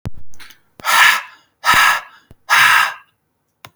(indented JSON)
{
  "exhalation_length": "3.8 s",
  "exhalation_amplitude": 32768,
  "exhalation_signal_mean_std_ratio": 0.53,
  "survey_phase": "beta (2021-08-13 to 2022-03-07)",
  "age": "18-44",
  "gender": "Male",
  "wearing_mask": "No",
  "symptom_none": true,
  "smoker_status": "Never smoked",
  "respiratory_condition_asthma": false,
  "respiratory_condition_other": false,
  "recruitment_source": "REACT",
  "submission_delay": "4 days",
  "covid_test_result": "Negative",
  "covid_test_method": "RT-qPCR",
  "influenza_a_test_result": "Negative",
  "influenza_b_test_result": "Negative"
}